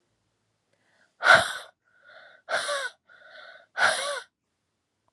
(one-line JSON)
{"exhalation_length": "5.1 s", "exhalation_amplitude": 24364, "exhalation_signal_mean_std_ratio": 0.31, "survey_phase": "alpha (2021-03-01 to 2021-08-12)", "age": "18-44", "gender": "Female", "wearing_mask": "No", "symptom_cough_any": true, "symptom_fatigue": true, "smoker_status": "Prefer not to say", "respiratory_condition_asthma": false, "respiratory_condition_other": false, "recruitment_source": "Test and Trace", "submission_delay": "2 days", "covid_test_result": "Positive", "covid_test_method": "RT-qPCR", "covid_ct_value": 23.6, "covid_ct_gene": "ORF1ab gene", "covid_ct_mean": 24.1, "covid_viral_load": "12000 copies/ml", "covid_viral_load_category": "Low viral load (10K-1M copies/ml)"}